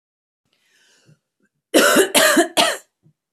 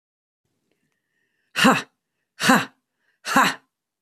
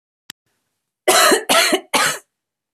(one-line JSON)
{"three_cough_length": "3.3 s", "three_cough_amplitude": 32767, "three_cough_signal_mean_std_ratio": 0.42, "exhalation_length": "4.0 s", "exhalation_amplitude": 30328, "exhalation_signal_mean_std_ratio": 0.31, "cough_length": "2.7 s", "cough_amplitude": 31106, "cough_signal_mean_std_ratio": 0.47, "survey_phase": "beta (2021-08-13 to 2022-03-07)", "age": "45-64", "gender": "Female", "wearing_mask": "No", "symptom_cough_any": true, "symptom_runny_or_blocked_nose": true, "symptom_abdominal_pain": true, "symptom_diarrhoea": true, "symptom_onset": "6 days", "smoker_status": "Current smoker (11 or more cigarettes per day)", "respiratory_condition_asthma": true, "respiratory_condition_other": false, "recruitment_source": "REACT", "submission_delay": "1 day", "covid_test_result": "Negative", "covid_test_method": "RT-qPCR", "influenza_a_test_result": "Negative", "influenza_b_test_result": "Negative"}